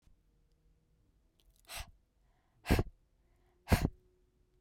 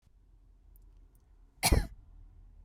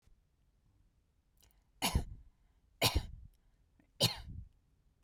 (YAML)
exhalation_length: 4.6 s
exhalation_amplitude: 7646
exhalation_signal_mean_std_ratio: 0.22
cough_length: 2.6 s
cough_amplitude: 10275
cough_signal_mean_std_ratio: 0.27
three_cough_length: 5.0 s
three_cough_amplitude: 6256
three_cough_signal_mean_std_ratio: 0.3
survey_phase: beta (2021-08-13 to 2022-03-07)
age: 18-44
gender: Female
wearing_mask: 'No'
symptom_none: true
smoker_status: Ex-smoker
respiratory_condition_asthma: false
respiratory_condition_other: false
recruitment_source: REACT
submission_delay: 0 days
covid_test_result: Negative
covid_test_method: RT-qPCR